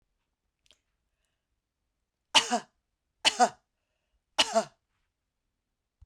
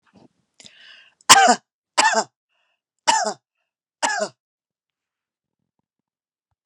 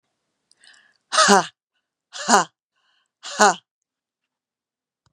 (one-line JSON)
{"three_cough_length": "6.1 s", "three_cough_amplitude": 16669, "three_cough_signal_mean_std_ratio": 0.22, "cough_length": "6.7 s", "cough_amplitude": 32768, "cough_signal_mean_std_ratio": 0.27, "exhalation_length": "5.1 s", "exhalation_amplitude": 32767, "exhalation_signal_mean_std_ratio": 0.26, "survey_phase": "beta (2021-08-13 to 2022-03-07)", "age": "45-64", "gender": "Female", "wearing_mask": "No", "symptom_other": true, "smoker_status": "Never smoked", "respiratory_condition_asthma": true, "respiratory_condition_other": false, "recruitment_source": "Test and Trace", "submission_delay": "4 days", "covid_test_result": "Negative", "covid_test_method": "RT-qPCR"}